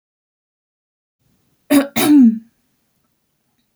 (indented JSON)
{
  "cough_length": "3.8 s",
  "cough_amplitude": 28518,
  "cough_signal_mean_std_ratio": 0.32,
  "survey_phase": "beta (2021-08-13 to 2022-03-07)",
  "age": "18-44",
  "gender": "Female",
  "wearing_mask": "No",
  "symptom_abdominal_pain": true,
  "symptom_fatigue": true,
  "symptom_onset": "12 days",
  "smoker_status": "Never smoked",
  "respiratory_condition_asthma": false,
  "respiratory_condition_other": false,
  "recruitment_source": "REACT",
  "submission_delay": "3 days",
  "covid_test_result": "Negative",
  "covid_test_method": "RT-qPCR"
}